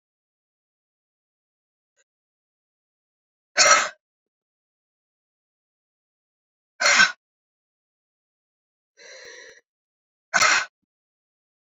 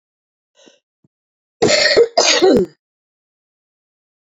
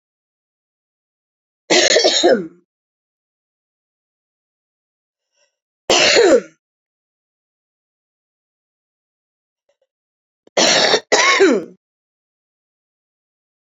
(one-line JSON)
{"exhalation_length": "11.8 s", "exhalation_amplitude": 27882, "exhalation_signal_mean_std_ratio": 0.21, "cough_length": "4.4 s", "cough_amplitude": 32768, "cough_signal_mean_std_ratio": 0.39, "three_cough_length": "13.7 s", "three_cough_amplitude": 31168, "three_cough_signal_mean_std_ratio": 0.32, "survey_phase": "beta (2021-08-13 to 2022-03-07)", "age": "45-64", "gender": "Female", "wearing_mask": "No", "symptom_cough_any": true, "symptom_runny_or_blocked_nose": true, "symptom_fatigue": true, "smoker_status": "Ex-smoker", "respiratory_condition_asthma": true, "respiratory_condition_other": false, "recruitment_source": "Test and Trace", "submission_delay": "2 days", "covid_test_result": "Positive", "covid_test_method": "LFT"}